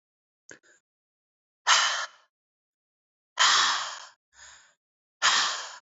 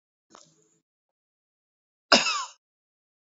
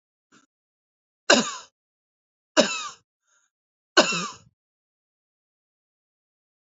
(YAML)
exhalation_length: 6.0 s
exhalation_amplitude: 17020
exhalation_signal_mean_std_ratio: 0.37
cough_length: 3.3 s
cough_amplitude: 26566
cough_signal_mean_std_ratio: 0.2
three_cough_length: 6.7 s
three_cough_amplitude: 28680
three_cough_signal_mean_std_ratio: 0.22
survey_phase: alpha (2021-03-01 to 2021-08-12)
age: 18-44
gender: Male
wearing_mask: 'No'
symptom_fever_high_temperature: true
symptom_headache: true
symptom_change_to_sense_of_smell_or_taste: true
smoker_status: Ex-smoker
respiratory_condition_asthma: false
respiratory_condition_other: false
recruitment_source: Test and Trace
submission_delay: 1 day
covid_test_result: Positive
covid_test_method: RT-qPCR
covid_ct_value: 19.7
covid_ct_gene: ORF1ab gene
covid_ct_mean: 20.4
covid_viral_load: 200000 copies/ml
covid_viral_load_category: Low viral load (10K-1M copies/ml)